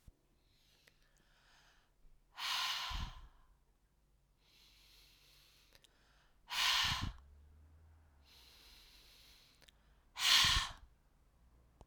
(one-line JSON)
{"exhalation_length": "11.9 s", "exhalation_amplitude": 6171, "exhalation_signal_mean_std_ratio": 0.33, "survey_phase": "alpha (2021-03-01 to 2021-08-12)", "age": "45-64", "gender": "Female", "wearing_mask": "No", "symptom_cough_any": true, "symptom_fatigue": true, "symptom_headache": true, "smoker_status": "Never smoked", "respiratory_condition_asthma": false, "respiratory_condition_other": false, "recruitment_source": "Test and Trace", "submission_delay": "1 day", "covid_test_result": "Positive", "covid_test_method": "RT-qPCR", "covid_ct_value": 24.5, "covid_ct_gene": "ORF1ab gene"}